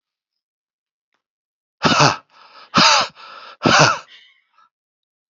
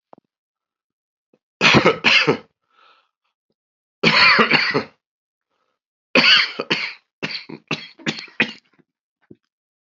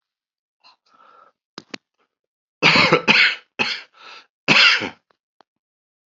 {
  "exhalation_length": "5.3 s",
  "exhalation_amplitude": 32304,
  "exhalation_signal_mean_std_ratio": 0.35,
  "three_cough_length": "10.0 s",
  "three_cough_amplitude": 31424,
  "three_cough_signal_mean_std_ratio": 0.37,
  "cough_length": "6.1 s",
  "cough_amplitude": 32768,
  "cough_signal_mean_std_ratio": 0.35,
  "survey_phase": "alpha (2021-03-01 to 2021-08-12)",
  "age": "45-64",
  "gender": "Male",
  "wearing_mask": "No",
  "symptom_cough_any": true,
  "symptom_shortness_of_breath": true,
  "symptom_abdominal_pain": true,
  "symptom_diarrhoea": true,
  "symptom_fatigue": true,
  "symptom_change_to_sense_of_smell_or_taste": true,
  "smoker_status": "Never smoked",
  "respiratory_condition_asthma": true,
  "respiratory_condition_other": false,
  "recruitment_source": "Test and Trace",
  "submission_delay": "1 day",
  "covid_test_result": "Positive",
  "covid_test_method": "RT-qPCR",
  "covid_ct_value": 13.8,
  "covid_ct_gene": "ORF1ab gene",
  "covid_ct_mean": 14.1,
  "covid_viral_load": "24000000 copies/ml",
  "covid_viral_load_category": "High viral load (>1M copies/ml)"
}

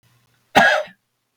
{
  "cough_length": "1.4 s",
  "cough_amplitude": 32766,
  "cough_signal_mean_std_ratio": 0.36,
  "survey_phase": "beta (2021-08-13 to 2022-03-07)",
  "age": "45-64",
  "gender": "Male",
  "wearing_mask": "No",
  "symptom_none": true,
  "smoker_status": "Never smoked",
  "respiratory_condition_asthma": false,
  "respiratory_condition_other": false,
  "recruitment_source": "REACT",
  "submission_delay": "1 day",
  "covid_test_result": "Negative",
  "covid_test_method": "RT-qPCR",
  "influenza_a_test_result": "Negative",
  "influenza_b_test_result": "Negative"
}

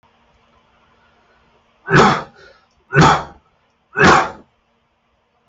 {
  "three_cough_length": "5.5 s",
  "three_cough_amplitude": 30543,
  "three_cough_signal_mean_std_ratio": 0.34,
  "survey_phase": "alpha (2021-03-01 to 2021-08-12)",
  "age": "18-44",
  "gender": "Male",
  "wearing_mask": "No",
  "symptom_none": true,
  "smoker_status": "Ex-smoker",
  "respiratory_condition_asthma": false,
  "respiratory_condition_other": false,
  "recruitment_source": "REACT",
  "submission_delay": "2 days",
  "covid_test_result": "Negative",
  "covid_test_method": "RT-qPCR"
}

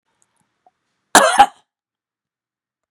{
  "cough_length": "2.9 s",
  "cough_amplitude": 32768,
  "cough_signal_mean_std_ratio": 0.24,
  "survey_phase": "beta (2021-08-13 to 2022-03-07)",
  "age": "65+",
  "gender": "Male",
  "wearing_mask": "No",
  "symptom_none": true,
  "smoker_status": "Never smoked",
  "respiratory_condition_asthma": false,
  "respiratory_condition_other": false,
  "recruitment_source": "REACT",
  "submission_delay": "3 days",
  "covid_test_result": "Negative",
  "covid_test_method": "RT-qPCR"
}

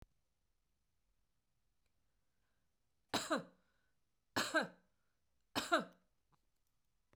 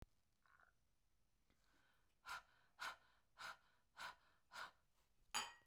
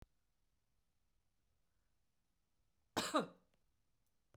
{
  "three_cough_length": "7.2 s",
  "three_cough_amplitude": 3025,
  "three_cough_signal_mean_std_ratio": 0.25,
  "exhalation_length": "5.7 s",
  "exhalation_amplitude": 818,
  "exhalation_signal_mean_std_ratio": 0.38,
  "cough_length": "4.4 s",
  "cough_amplitude": 1951,
  "cough_signal_mean_std_ratio": 0.2,
  "survey_phase": "beta (2021-08-13 to 2022-03-07)",
  "age": "45-64",
  "gender": "Female",
  "wearing_mask": "No",
  "symptom_fatigue": true,
  "smoker_status": "Never smoked",
  "respiratory_condition_asthma": false,
  "respiratory_condition_other": false,
  "recruitment_source": "REACT",
  "submission_delay": "1 day",
  "covid_test_result": "Negative",
  "covid_test_method": "RT-qPCR",
  "influenza_a_test_result": "Negative",
  "influenza_b_test_result": "Negative"
}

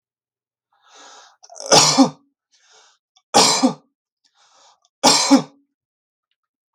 {
  "three_cough_length": "6.7 s",
  "three_cough_amplitude": 32768,
  "three_cough_signal_mean_std_ratio": 0.33,
  "survey_phase": "beta (2021-08-13 to 2022-03-07)",
  "age": "18-44",
  "gender": "Male",
  "wearing_mask": "No",
  "symptom_none": true,
  "smoker_status": "Never smoked",
  "respiratory_condition_asthma": false,
  "respiratory_condition_other": false,
  "recruitment_source": "REACT",
  "submission_delay": "1 day",
  "covid_test_result": "Negative",
  "covid_test_method": "RT-qPCR",
  "influenza_a_test_result": "Negative",
  "influenza_b_test_result": "Negative"
}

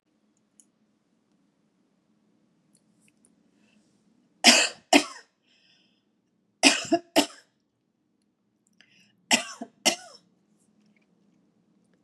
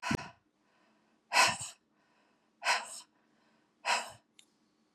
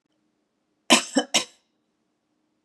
{
  "three_cough_length": "12.0 s",
  "three_cough_amplitude": 31996,
  "three_cough_signal_mean_std_ratio": 0.21,
  "exhalation_length": "4.9 s",
  "exhalation_amplitude": 8278,
  "exhalation_signal_mean_std_ratio": 0.32,
  "cough_length": "2.6 s",
  "cough_amplitude": 28867,
  "cough_signal_mean_std_ratio": 0.24,
  "survey_phase": "beta (2021-08-13 to 2022-03-07)",
  "age": "45-64",
  "gender": "Female",
  "wearing_mask": "No",
  "symptom_runny_or_blocked_nose": true,
  "smoker_status": "Never smoked",
  "respiratory_condition_asthma": false,
  "respiratory_condition_other": false,
  "recruitment_source": "REACT",
  "submission_delay": "1 day",
  "covid_test_result": "Negative",
  "covid_test_method": "RT-qPCR",
  "influenza_a_test_result": "Negative",
  "influenza_b_test_result": "Negative"
}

